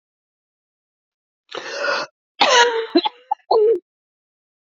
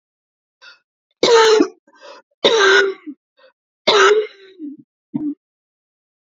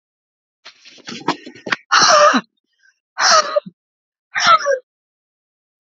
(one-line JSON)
{"cough_length": "4.6 s", "cough_amplitude": 29068, "cough_signal_mean_std_ratio": 0.42, "three_cough_length": "6.3 s", "three_cough_amplitude": 29035, "three_cough_signal_mean_std_ratio": 0.42, "exhalation_length": "5.9 s", "exhalation_amplitude": 32768, "exhalation_signal_mean_std_ratio": 0.4, "survey_phase": "beta (2021-08-13 to 2022-03-07)", "age": "65+", "gender": "Female", "wearing_mask": "No", "symptom_cough_any": true, "symptom_runny_or_blocked_nose": true, "symptom_fatigue": true, "symptom_headache": true, "symptom_onset": "4 days", "smoker_status": "Never smoked", "respiratory_condition_asthma": false, "respiratory_condition_other": false, "recruitment_source": "Test and Trace", "submission_delay": "2 days", "covid_test_result": "Positive", "covid_test_method": "RT-qPCR", "covid_ct_value": 17.1, "covid_ct_gene": "ORF1ab gene", "covid_ct_mean": 17.6, "covid_viral_load": "1700000 copies/ml", "covid_viral_load_category": "High viral load (>1M copies/ml)"}